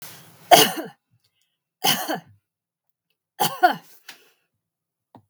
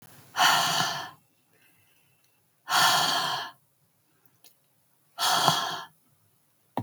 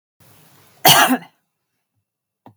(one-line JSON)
{"three_cough_length": "5.3 s", "three_cough_amplitude": 32768, "three_cough_signal_mean_std_ratio": 0.27, "exhalation_length": "6.8 s", "exhalation_amplitude": 21615, "exhalation_signal_mean_std_ratio": 0.45, "cough_length": "2.6 s", "cough_amplitude": 32768, "cough_signal_mean_std_ratio": 0.29, "survey_phase": "beta (2021-08-13 to 2022-03-07)", "age": "45-64", "gender": "Female", "wearing_mask": "No", "symptom_none": true, "smoker_status": "Never smoked", "respiratory_condition_asthma": false, "respiratory_condition_other": false, "recruitment_source": "REACT", "submission_delay": "2 days", "covid_test_result": "Negative", "covid_test_method": "RT-qPCR", "influenza_a_test_result": "Negative", "influenza_b_test_result": "Negative"}